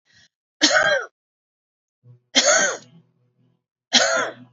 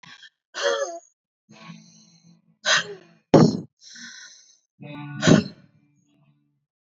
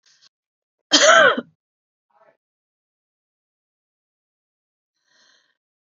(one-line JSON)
{"three_cough_length": "4.5 s", "three_cough_amplitude": 28460, "three_cough_signal_mean_std_ratio": 0.41, "exhalation_length": "7.0 s", "exhalation_amplitude": 29500, "exhalation_signal_mean_std_ratio": 0.3, "cough_length": "5.8 s", "cough_amplitude": 29758, "cough_signal_mean_std_ratio": 0.22, "survey_phase": "beta (2021-08-13 to 2022-03-07)", "age": "45-64", "gender": "Female", "wearing_mask": "No", "symptom_none": true, "smoker_status": "Never smoked", "respiratory_condition_asthma": false, "respiratory_condition_other": false, "recruitment_source": "REACT", "submission_delay": "1 day", "covid_test_result": "Negative", "covid_test_method": "RT-qPCR", "influenza_a_test_result": "Negative", "influenza_b_test_result": "Negative"}